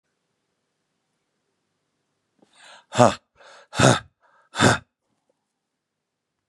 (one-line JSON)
{"exhalation_length": "6.5 s", "exhalation_amplitude": 32767, "exhalation_signal_mean_std_ratio": 0.22, "survey_phase": "beta (2021-08-13 to 2022-03-07)", "age": "45-64", "gender": "Male", "wearing_mask": "No", "symptom_fatigue": true, "symptom_onset": "13 days", "smoker_status": "Never smoked", "respiratory_condition_asthma": false, "respiratory_condition_other": false, "recruitment_source": "REACT", "submission_delay": "7 days", "covid_test_result": "Negative", "covid_test_method": "RT-qPCR"}